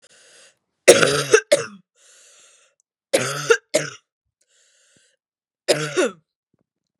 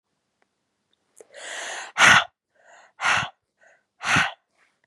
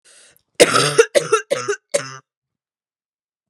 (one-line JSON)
{"three_cough_length": "7.0 s", "three_cough_amplitude": 32768, "three_cough_signal_mean_std_ratio": 0.3, "exhalation_length": "4.9 s", "exhalation_amplitude": 30313, "exhalation_signal_mean_std_ratio": 0.32, "cough_length": "3.5 s", "cough_amplitude": 32768, "cough_signal_mean_std_ratio": 0.35, "survey_phase": "beta (2021-08-13 to 2022-03-07)", "age": "18-44", "gender": "Female", "wearing_mask": "No", "symptom_cough_any": true, "symptom_runny_or_blocked_nose": true, "symptom_sore_throat": true, "symptom_fatigue": true, "symptom_headache": true, "smoker_status": "Never smoked", "respiratory_condition_asthma": false, "respiratory_condition_other": false, "recruitment_source": "Test and Trace", "submission_delay": "2 days", "covid_test_result": "Positive", "covid_test_method": "LFT"}